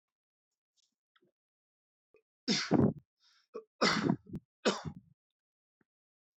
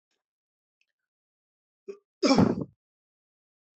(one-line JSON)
{"three_cough_length": "6.4 s", "three_cough_amplitude": 6418, "three_cough_signal_mean_std_ratio": 0.3, "cough_length": "3.8 s", "cough_amplitude": 12149, "cough_signal_mean_std_ratio": 0.24, "survey_phase": "alpha (2021-03-01 to 2021-08-12)", "age": "18-44", "gender": "Male", "wearing_mask": "No", "symptom_none": true, "symptom_onset": "5 days", "smoker_status": "Never smoked", "respiratory_condition_asthma": false, "respiratory_condition_other": false, "recruitment_source": "Test and Trace", "submission_delay": "2 days", "covid_test_result": "Positive", "covid_test_method": "RT-qPCR", "covid_ct_value": 29.7, "covid_ct_gene": "ORF1ab gene", "covid_ct_mean": 30.4, "covid_viral_load": "110 copies/ml", "covid_viral_load_category": "Minimal viral load (< 10K copies/ml)"}